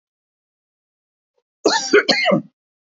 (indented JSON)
{
  "cough_length": "3.0 s",
  "cough_amplitude": 27629,
  "cough_signal_mean_std_ratio": 0.36,
  "survey_phase": "beta (2021-08-13 to 2022-03-07)",
  "age": "18-44",
  "gender": "Male",
  "wearing_mask": "No",
  "symptom_cough_any": true,
  "symptom_runny_or_blocked_nose": true,
  "symptom_sore_throat": true,
  "symptom_fatigue": true,
  "symptom_headache": true,
  "symptom_change_to_sense_of_smell_or_taste": true,
  "symptom_onset": "3 days",
  "smoker_status": "Never smoked",
  "respiratory_condition_asthma": false,
  "respiratory_condition_other": false,
  "recruitment_source": "Test and Trace",
  "submission_delay": "1 day",
  "covid_test_method": "ePCR"
}